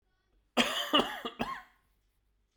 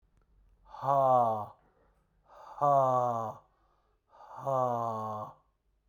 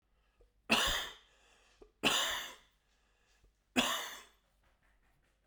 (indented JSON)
{
  "cough_length": "2.6 s",
  "cough_amplitude": 10296,
  "cough_signal_mean_std_ratio": 0.39,
  "exhalation_length": "5.9 s",
  "exhalation_amplitude": 6023,
  "exhalation_signal_mean_std_ratio": 0.5,
  "three_cough_length": "5.5 s",
  "three_cough_amplitude": 5621,
  "three_cough_signal_mean_std_ratio": 0.37,
  "survey_phase": "beta (2021-08-13 to 2022-03-07)",
  "age": "45-64",
  "gender": "Male",
  "wearing_mask": "No",
  "symptom_cough_any": true,
  "symptom_runny_or_blocked_nose": true,
  "symptom_sore_throat": true,
  "symptom_abdominal_pain": true,
  "symptom_diarrhoea": true,
  "symptom_fatigue": true,
  "symptom_fever_high_temperature": true,
  "symptom_headache": true,
  "symptom_change_to_sense_of_smell_or_taste": true,
  "symptom_loss_of_taste": true,
  "symptom_onset": "2 days",
  "smoker_status": "Never smoked",
  "respiratory_condition_asthma": false,
  "respiratory_condition_other": false,
  "recruitment_source": "Test and Trace",
  "submission_delay": "2 days",
  "covid_test_result": "Positive",
  "covid_test_method": "ePCR"
}